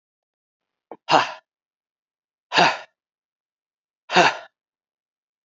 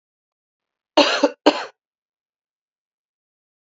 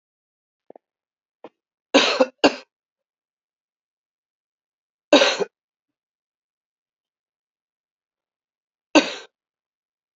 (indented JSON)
{
  "exhalation_length": "5.5 s",
  "exhalation_amplitude": 27610,
  "exhalation_signal_mean_std_ratio": 0.26,
  "cough_length": "3.7 s",
  "cough_amplitude": 32123,
  "cough_signal_mean_std_ratio": 0.24,
  "three_cough_length": "10.2 s",
  "three_cough_amplitude": 29184,
  "three_cough_signal_mean_std_ratio": 0.2,
  "survey_phase": "beta (2021-08-13 to 2022-03-07)",
  "age": "18-44",
  "gender": "Male",
  "wearing_mask": "No",
  "symptom_cough_any": true,
  "symptom_shortness_of_breath": true,
  "symptom_fatigue": true,
  "symptom_fever_high_temperature": true,
  "symptom_onset": "3 days",
  "smoker_status": "Never smoked",
  "respiratory_condition_asthma": false,
  "respiratory_condition_other": false,
  "recruitment_source": "Test and Trace",
  "submission_delay": "2 days",
  "covid_test_result": "Positive",
  "covid_test_method": "RT-qPCR"
}